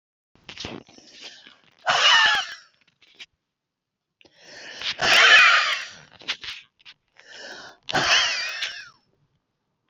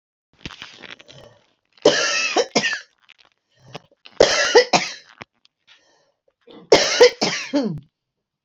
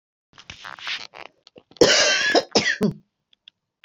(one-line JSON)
{"exhalation_length": "9.9 s", "exhalation_amplitude": 26490, "exhalation_signal_mean_std_ratio": 0.4, "three_cough_length": "8.4 s", "three_cough_amplitude": 30476, "three_cough_signal_mean_std_ratio": 0.37, "cough_length": "3.8 s", "cough_amplitude": 27510, "cough_signal_mean_std_ratio": 0.42, "survey_phase": "beta (2021-08-13 to 2022-03-07)", "age": "45-64", "gender": "Female", "wearing_mask": "No", "symptom_cough_any": true, "symptom_new_continuous_cough": true, "symptom_runny_or_blocked_nose": true, "symptom_abdominal_pain": true, "symptom_headache": true, "symptom_other": true, "symptom_onset": "12 days", "smoker_status": "Ex-smoker", "respiratory_condition_asthma": true, "respiratory_condition_other": false, "recruitment_source": "REACT", "submission_delay": "1 day", "covid_test_result": "Positive", "covid_test_method": "RT-qPCR", "covid_ct_value": 32.0, "covid_ct_gene": "N gene", "influenza_a_test_result": "Negative", "influenza_b_test_result": "Negative"}